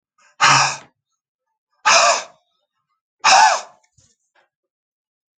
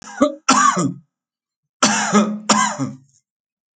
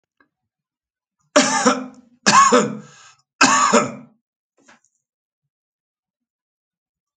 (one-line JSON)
{"exhalation_length": "5.4 s", "exhalation_amplitude": 30450, "exhalation_signal_mean_std_ratio": 0.36, "cough_length": "3.8 s", "cough_amplitude": 31049, "cough_signal_mean_std_ratio": 0.52, "three_cough_length": "7.2 s", "three_cough_amplitude": 31207, "three_cough_signal_mean_std_ratio": 0.35, "survey_phase": "alpha (2021-03-01 to 2021-08-12)", "age": "65+", "gender": "Male", "wearing_mask": "No", "symptom_none": true, "smoker_status": "Never smoked", "respiratory_condition_asthma": false, "respiratory_condition_other": false, "recruitment_source": "REACT", "submission_delay": "1 day", "covid_test_result": "Negative", "covid_test_method": "RT-qPCR"}